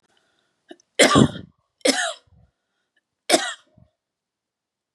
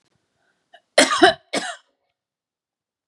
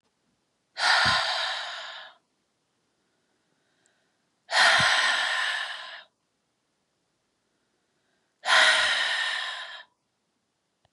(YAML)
three_cough_length: 4.9 s
three_cough_amplitude: 30326
three_cough_signal_mean_std_ratio: 0.28
cough_length: 3.1 s
cough_amplitude: 31750
cough_signal_mean_std_ratio: 0.27
exhalation_length: 10.9 s
exhalation_amplitude: 14266
exhalation_signal_mean_std_ratio: 0.45
survey_phase: beta (2021-08-13 to 2022-03-07)
age: 45-64
gender: Female
wearing_mask: 'No'
symptom_cough_any: true
symptom_shortness_of_breath: true
symptom_sore_throat: true
symptom_fatigue: true
symptom_headache: true
symptom_change_to_sense_of_smell_or_taste: true
symptom_other: true
symptom_onset: 5 days
smoker_status: Never smoked
respiratory_condition_asthma: false
respiratory_condition_other: false
recruitment_source: Test and Trace
submission_delay: 2 days
covid_test_result: Positive
covid_test_method: RT-qPCR
covid_ct_value: 22.3
covid_ct_gene: ORF1ab gene
covid_ct_mean: 22.7
covid_viral_load: 35000 copies/ml
covid_viral_load_category: Low viral load (10K-1M copies/ml)